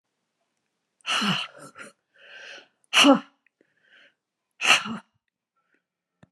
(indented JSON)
{
  "exhalation_length": "6.3 s",
  "exhalation_amplitude": 21676,
  "exhalation_signal_mean_std_ratio": 0.28,
  "survey_phase": "alpha (2021-03-01 to 2021-08-12)",
  "age": "65+",
  "gender": "Female",
  "wearing_mask": "No",
  "symptom_none": true,
  "smoker_status": "Ex-smoker",
  "respiratory_condition_asthma": false,
  "respiratory_condition_other": true,
  "recruitment_source": "REACT",
  "submission_delay": "1 day",
  "covid_test_result": "Negative",
  "covid_test_method": "RT-qPCR"
}